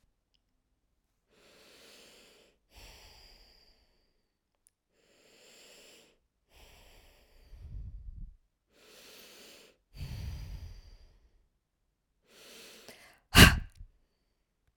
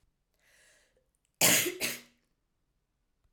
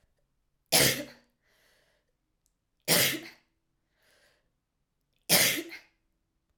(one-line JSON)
{"exhalation_length": "14.8 s", "exhalation_amplitude": 31002, "exhalation_signal_mean_std_ratio": 0.16, "cough_length": "3.3 s", "cough_amplitude": 10748, "cough_signal_mean_std_ratio": 0.28, "three_cough_length": "6.6 s", "three_cough_amplitude": 14051, "three_cough_signal_mean_std_ratio": 0.3, "survey_phase": "alpha (2021-03-01 to 2021-08-12)", "age": "18-44", "gender": "Female", "wearing_mask": "No", "symptom_none": true, "symptom_onset": "12 days", "smoker_status": "Never smoked", "respiratory_condition_asthma": true, "respiratory_condition_other": false, "recruitment_source": "REACT", "submission_delay": "1 day", "covid_test_result": "Negative", "covid_test_method": "RT-qPCR"}